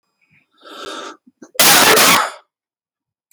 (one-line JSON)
{"cough_length": "3.3 s", "cough_amplitude": 32768, "cough_signal_mean_std_ratio": 0.43, "survey_phase": "beta (2021-08-13 to 2022-03-07)", "age": "45-64", "gender": "Male", "wearing_mask": "No", "symptom_runny_or_blocked_nose": true, "smoker_status": "Never smoked", "respiratory_condition_asthma": true, "respiratory_condition_other": false, "recruitment_source": "REACT", "submission_delay": "0 days", "covid_test_result": "Negative", "covid_test_method": "RT-qPCR", "influenza_a_test_result": "Negative", "influenza_b_test_result": "Negative"}